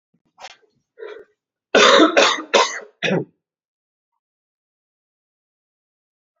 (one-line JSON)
{"cough_length": "6.4 s", "cough_amplitude": 32768, "cough_signal_mean_std_ratio": 0.31, "survey_phase": "beta (2021-08-13 to 2022-03-07)", "age": "18-44", "gender": "Male", "wearing_mask": "No", "symptom_cough_any": true, "symptom_runny_or_blocked_nose": true, "symptom_fever_high_temperature": true, "symptom_headache": true, "symptom_change_to_sense_of_smell_or_taste": true, "symptom_onset": "9 days", "smoker_status": "Never smoked", "respiratory_condition_asthma": false, "respiratory_condition_other": false, "recruitment_source": "Test and Trace", "submission_delay": "2 days", "covid_test_result": "Positive", "covid_test_method": "RT-qPCR", "covid_ct_value": 23.6, "covid_ct_gene": "ORF1ab gene", "covid_ct_mean": 23.7, "covid_viral_load": "17000 copies/ml", "covid_viral_load_category": "Low viral load (10K-1M copies/ml)"}